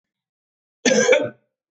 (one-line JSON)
{"cough_length": "1.7 s", "cough_amplitude": 24708, "cough_signal_mean_std_ratio": 0.4, "survey_phase": "beta (2021-08-13 to 2022-03-07)", "age": "45-64", "gender": "Male", "wearing_mask": "No", "symptom_runny_or_blocked_nose": true, "symptom_sore_throat": true, "symptom_change_to_sense_of_smell_or_taste": true, "symptom_loss_of_taste": true, "symptom_onset": "3 days", "smoker_status": "Never smoked", "respiratory_condition_asthma": false, "respiratory_condition_other": false, "recruitment_source": "Test and Trace", "submission_delay": "1 day", "covid_test_result": "Positive", "covid_test_method": "RT-qPCR", "covid_ct_value": 17.5, "covid_ct_gene": "ORF1ab gene", "covid_ct_mean": 17.7, "covid_viral_load": "1600000 copies/ml", "covid_viral_load_category": "High viral load (>1M copies/ml)"}